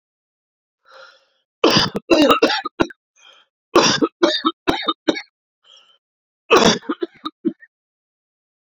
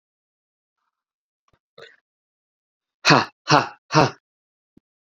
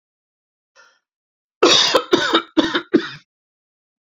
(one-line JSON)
{"three_cough_length": "8.8 s", "three_cough_amplitude": 29051, "three_cough_signal_mean_std_ratio": 0.38, "exhalation_length": "5.0 s", "exhalation_amplitude": 28356, "exhalation_signal_mean_std_ratio": 0.23, "cough_length": "4.2 s", "cough_amplitude": 29770, "cough_signal_mean_std_ratio": 0.38, "survey_phase": "beta (2021-08-13 to 2022-03-07)", "age": "18-44", "gender": "Male", "wearing_mask": "No", "symptom_cough_any": true, "symptom_runny_or_blocked_nose": true, "symptom_fever_high_temperature": true, "symptom_onset": "4 days", "smoker_status": "Never smoked", "respiratory_condition_asthma": false, "respiratory_condition_other": false, "recruitment_source": "Test and Trace", "submission_delay": "3 days", "covid_test_result": "Positive", "covid_test_method": "RT-qPCR", "covid_ct_value": 22.5, "covid_ct_gene": "ORF1ab gene", "covid_ct_mean": 23.6, "covid_viral_load": "19000 copies/ml", "covid_viral_load_category": "Low viral load (10K-1M copies/ml)"}